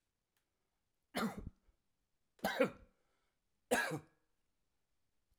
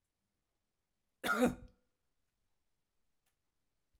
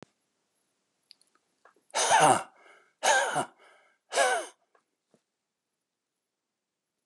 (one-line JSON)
{"three_cough_length": "5.4 s", "three_cough_amplitude": 3574, "three_cough_signal_mean_std_ratio": 0.29, "cough_length": "4.0 s", "cough_amplitude": 3740, "cough_signal_mean_std_ratio": 0.22, "exhalation_length": "7.1 s", "exhalation_amplitude": 11565, "exhalation_signal_mean_std_ratio": 0.32, "survey_phase": "alpha (2021-03-01 to 2021-08-12)", "age": "65+", "gender": "Male", "wearing_mask": "No", "symptom_change_to_sense_of_smell_or_taste": true, "smoker_status": "Never smoked", "respiratory_condition_asthma": false, "respiratory_condition_other": false, "recruitment_source": "REACT", "submission_delay": "1 day", "covid_test_result": "Negative", "covid_test_method": "RT-qPCR"}